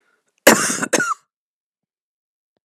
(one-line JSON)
{"cough_length": "2.6 s", "cough_amplitude": 32768, "cough_signal_mean_std_ratio": 0.31, "survey_phase": "alpha (2021-03-01 to 2021-08-12)", "age": "45-64", "gender": "Female", "wearing_mask": "No", "symptom_cough_any": true, "symptom_shortness_of_breath": true, "symptom_fatigue": true, "symptom_fever_high_temperature": true, "symptom_change_to_sense_of_smell_or_taste": true, "symptom_loss_of_taste": true, "symptom_onset": "6 days", "smoker_status": "Never smoked", "respiratory_condition_asthma": false, "respiratory_condition_other": false, "recruitment_source": "Test and Trace", "submission_delay": "2 days", "covid_test_result": "Positive", "covid_test_method": "RT-qPCR", "covid_ct_value": 17.7, "covid_ct_gene": "N gene", "covid_ct_mean": 17.7, "covid_viral_load": "1600000 copies/ml", "covid_viral_load_category": "High viral load (>1M copies/ml)"}